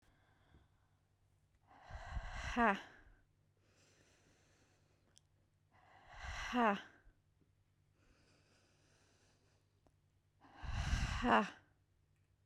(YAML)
exhalation_length: 12.5 s
exhalation_amplitude: 4270
exhalation_signal_mean_std_ratio: 0.31
survey_phase: beta (2021-08-13 to 2022-03-07)
age: 18-44
gender: Female
wearing_mask: 'No'
symptom_none: true
smoker_status: Ex-smoker
respiratory_condition_asthma: false
respiratory_condition_other: false
recruitment_source: REACT
submission_delay: 2 days
covid_test_result: Negative
covid_test_method: RT-qPCR